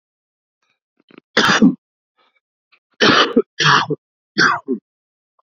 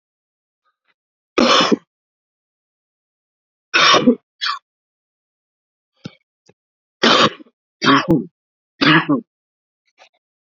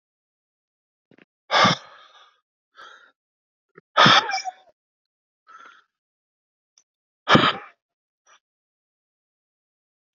cough_length: 5.5 s
cough_amplitude: 30876
cough_signal_mean_std_ratio: 0.39
three_cough_length: 10.4 s
three_cough_amplitude: 32767
three_cough_signal_mean_std_ratio: 0.34
exhalation_length: 10.2 s
exhalation_amplitude: 27877
exhalation_signal_mean_std_ratio: 0.23
survey_phase: beta (2021-08-13 to 2022-03-07)
age: 18-44
gender: Male
wearing_mask: 'No'
symptom_cough_any: true
symptom_sore_throat: true
symptom_fatigue: true
symptom_headache: true
symptom_onset: 3 days
smoker_status: Ex-smoker
respiratory_condition_asthma: false
respiratory_condition_other: false
recruitment_source: Test and Trace
submission_delay: 2 days
covid_test_result: Positive
covid_test_method: RT-qPCR
covid_ct_value: 19.9
covid_ct_gene: ORF1ab gene
covid_ct_mean: 20.5
covid_viral_load: 190000 copies/ml
covid_viral_load_category: Low viral load (10K-1M copies/ml)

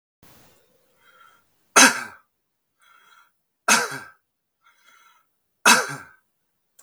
three_cough_length: 6.8 s
three_cough_amplitude: 32768
three_cough_signal_mean_std_ratio: 0.24
survey_phase: beta (2021-08-13 to 2022-03-07)
age: 18-44
gender: Male
wearing_mask: 'No'
symptom_none: true
smoker_status: Never smoked
respiratory_condition_asthma: false
respiratory_condition_other: false
recruitment_source: REACT
submission_delay: 1 day
covid_test_result: Negative
covid_test_method: RT-qPCR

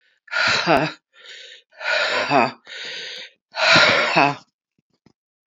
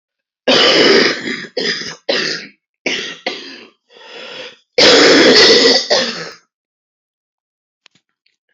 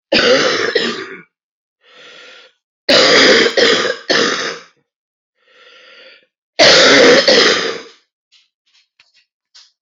exhalation_length: 5.5 s
exhalation_amplitude: 28210
exhalation_signal_mean_std_ratio: 0.52
cough_length: 8.5 s
cough_amplitude: 32768
cough_signal_mean_std_ratio: 0.51
three_cough_length: 9.8 s
three_cough_amplitude: 32767
three_cough_signal_mean_std_ratio: 0.51
survey_phase: beta (2021-08-13 to 2022-03-07)
age: 45-64
gender: Female
wearing_mask: 'No'
symptom_cough_any: true
symptom_runny_or_blocked_nose: true
symptom_shortness_of_breath: true
symptom_abdominal_pain: true
symptom_fatigue: true
symptom_headache: true
symptom_change_to_sense_of_smell_or_taste: true
symptom_onset: 3 days
smoker_status: Current smoker (1 to 10 cigarettes per day)
respiratory_condition_asthma: false
respiratory_condition_other: false
recruitment_source: Test and Trace
submission_delay: 1 day
covid_test_result: Positive
covid_test_method: RT-qPCR
covid_ct_value: 13.3
covid_ct_gene: ORF1ab gene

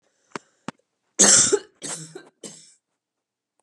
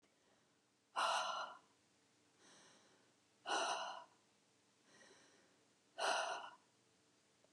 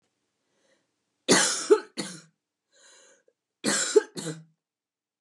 three_cough_length: 3.6 s
three_cough_amplitude: 30066
three_cough_signal_mean_std_ratio: 0.29
exhalation_length: 7.5 s
exhalation_amplitude: 2138
exhalation_signal_mean_std_ratio: 0.4
cough_length: 5.2 s
cough_amplitude: 17906
cough_signal_mean_std_ratio: 0.31
survey_phase: beta (2021-08-13 to 2022-03-07)
age: 18-44
gender: Female
wearing_mask: 'No'
symptom_cough_any: true
symptom_new_continuous_cough: true
symptom_runny_or_blocked_nose: true
symptom_sore_throat: true
symptom_fatigue: true
symptom_headache: true
symptom_onset: 4 days
smoker_status: Ex-smoker
respiratory_condition_asthma: false
respiratory_condition_other: false
recruitment_source: Test and Trace
submission_delay: 2 days
covid_test_result: Positive
covid_test_method: RT-qPCR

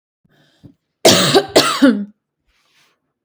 cough_length: 3.2 s
cough_amplitude: 32768
cough_signal_mean_std_ratio: 0.4
survey_phase: beta (2021-08-13 to 2022-03-07)
age: 18-44
gender: Female
wearing_mask: 'No'
symptom_none: true
smoker_status: Never smoked
respiratory_condition_asthma: false
respiratory_condition_other: false
recruitment_source: REACT
submission_delay: 1 day
covid_test_result: Negative
covid_test_method: RT-qPCR
influenza_a_test_result: Negative
influenza_b_test_result: Negative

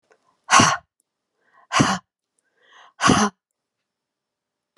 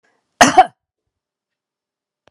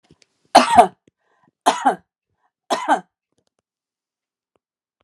exhalation_length: 4.8 s
exhalation_amplitude: 31416
exhalation_signal_mean_std_ratio: 0.31
cough_length: 2.3 s
cough_amplitude: 32768
cough_signal_mean_std_ratio: 0.22
three_cough_length: 5.0 s
three_cough_amplitude: 32768
three_cough_signal_mean_std_ratio: 0.26
survey_phase: alpha (2021-03-01 to 2021-08-12)
age: 45-64
gender: Female
wearing_mask: 'No'
symptom_none: true
smoker_status: Ex-smoker
respiratory_condition_asthma: false
respiratory_condition_other: false
recruitment_source: REACT
submission_delay: 3 days
covid_test_result: Negative
covid_test_method: RT-qPCR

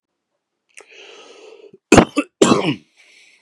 cough_length: 3.4 s
cough_amplitude: 32768
cough_signal_mean_std_ratio: 0.29
survey_phase: beta (2021-08-13 to 2022-03-07)
age: 45-64
gender: Male
wearing_mask: 'No'
symptom_runny_or_blocked_nose: true
symptom_headache: true
symptom_onset: 9 days
smoker_status: Never smoked
respiratory_condition_asthma: false
respiratory_condition_other: false
recruitment_source: REACT
submission_delay: 1 day
covid_test_result: Negative
covid_test_method: RT-qPCR
influenza_a_test_result: Negative
influenza_b_test_result: Negative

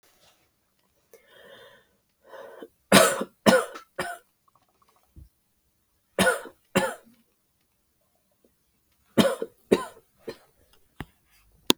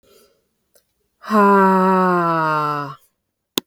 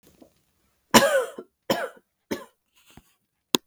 three_cough_length: 11.8 s
three_cough_amplitude: 32768
three_cough_signal_mean_std_ratio: 0.25
exhalation_length: 3.7 s
exhalation_amplitude: 32766
exhalation_signal_mean_std_ratio: 0.59
cough_length: 3.7 s
cough_amplitude: 32766
cough_signal_mean_std_ratio: 0.27
survey_phase: beta (2021-08-13 to 2022-03-07)
age: 18-44
gender: Female
wearing_mask: 'No'
symptom_cough_any: true
symptom_new_continuous_cough: true
symptom_runny_or_blocked_nose: true
symptom_shortness_of_breath: true
symptom_sore_throat: true
symptom_fatigue: true
symptom_onset: 4 days
smoker_status: Ex-smoker
respiratory_condition_asthma: false
respiratory_condition_other: false
recruitment_source: Test and Trace
submission_delay: 2 days
covid_test_result: Positive
covid_test_method: RT-qPCR
covid_ct_value: 19.2
covid_ct_gene: N gene
covid_ct_mean: 19.5
covid_viral_load: 400000 copies/ml
covid_viral_load_category: Low viral load (10K-1M copies/ml)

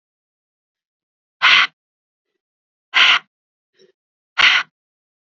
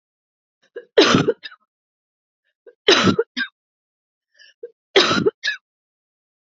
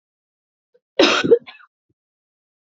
exhalation_length: 5.2 s
exhalation_amplitude: 30481
exhalation_signal_mean_std_ratio: 0.3
three_cough_length: 6.6 s
three_cough_amplitude: 32193
three_cough_signal_mean_std_ratio: 0.33
cough_length: 2.6 s
cough_amplitude: 28094
cough_signal_mean_std_ratio: 0.28
survey_phase: beta (2021-08-13 to 2022-03-07)
age: 45-64
gender: Female
wearing_mask: 'Yes'
symptom_runny_or_blocked_nose: true
symptom_headache: true
symptom_onset: 4 days
smoker_status: Current smoker (e-cigarettes or vapes only)
respiratory_condition_asthma: false
respiratory_condition_other: false
recruitment_source: Test and Trace
submission_delay: 1 day
covid_test_result: Positive
covid_test_method: RT-qPCR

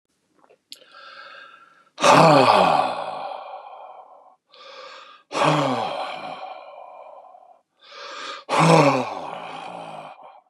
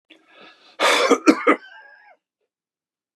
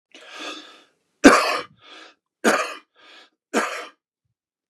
exhalation_length: 10.5 s
exhalation_amplitude: 30550
exhalation_signal_mean_std_ratio: 0.44
cough_length: 3.2 s
cough_amplitude: 32689
cough_signal_mean_std_ratio: 0.35
three_cough_length: 4.7 s
three_cough_amplitude: 32768
three_cough_signal_mean_std_ratio: 0.3
survey_phase: beta (2021-08-13 to 2022-03-07)
age: 65+
gender: Male
wearing_mask: 'No'
symptom_none: true
smoker_status: Never smoked
respiratory_condition_asthma: false
respiratory_condition_other: false
recruitment_source: REACT
submission_delay: 1 day
covid_test_result: Negative
covid_test_method: RT-qPCR
influenza_a_test_result: Negative
influenza_b_test_result: Negative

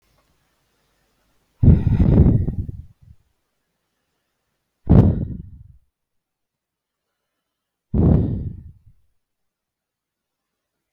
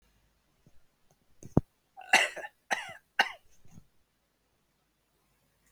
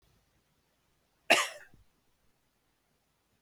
exhalation_length: 10.9 s
exhalation_amplitude: 32766
exhalation_signal_mean_std_ratio: 0.32
three_cough_length: 5.7 s
three_cough_amplitude: 14314
three_cough_signal_mean_std_ratio: 0.21
cough_length: 3.4 s
cough_amplitude: 13662
cough_signal_mean_std_ratio: 0.18
survey_phase: beta (2021-08-13 to 2022-03-07)
age: 45-64
gender: Male
wearing_mask: 'No'
symptom_none: true
smoker_status: Never smoked
respiratory_condition_asthma: false
respiratory_condition_other: false
recruitment_source: REACT
submission_delay: 1 day
covid_test_result: Negative
covid_test_method: RT-qPCR
covid_ct_value: 44.0
covid_ct_gene: N gene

